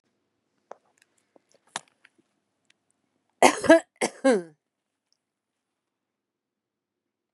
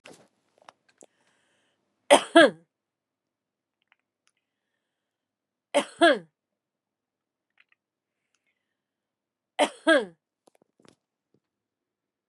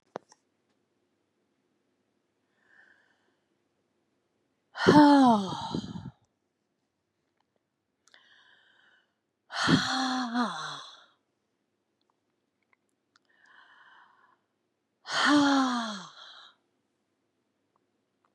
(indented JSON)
{
  "cough_length": "7.3 s",
  "cough_amplitude": 31732,
  "cough_signal_mean_std_ratio": 0.19,
  "three_cough_length": "12.3 s",
  "three_cough_amplitude": 26844,
  "three_cough_signal_mean_std_ratio": 0.18,
  "exhalation_length": "18.3 s",
  "exhalation_amplitude": 18557,
  "exhalation_signal_mean_std_ratio": 0.29,
  "survey_phase": "beta (2021-08-13 to 2022-03-07)",
  "age": "65+",
  "gender": "Female",
  "wearing_mask": "No",
  "symptom_none": true,
  "smoker_status": "Current smoker (1 to 10 cigarettes per day)",
  "respiratory_condition_asthma": false,
  "respiratory_condition_other": false,
  "recruitment_source": "REACT",
  "submission_delay": "39 days",
  "covid_test_result": "Negative",
  "covid_test_method": "RT-qPCR",
  "influenza_a_test_result": "Negative",
  "influenza_b_test_result": "Negative"
}